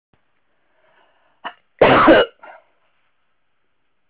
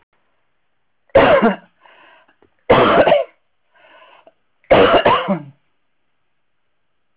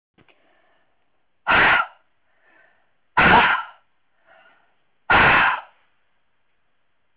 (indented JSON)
{
  "cough_length": "4.1 s",
  "cough_amplitude": 30729,
  "cough_signal_mean_std_ratio": 0.28,
  "three_cough_length": "7.2 s",
  "three_cough_amplitude": 31805,
  "three_cough_signal_mean_std_ratio": 0.39,
  "exhalation_length": "7.2 s",
  "exhalation_amplitude": 22487,
  "exhalation_signal_mean_std_ratio": 0.37,
  "survey_phase": "alpha (2021-03-01 to 2021-08-12)",
  "age": "65+",
  "gender": "Female",
  "wearing_mask": "No",
  "symptom_none": true,
  "smoker_status": "Never smoked",
  "respiratory_condition_asthma": false,
  "respiratory_condition_other": false,
  "recruitment_source": "REACT",
  "submission_delay": "1 day",
  "covid_test_result": "Negative",
  "covid_test_method": "RT-qPCR"
}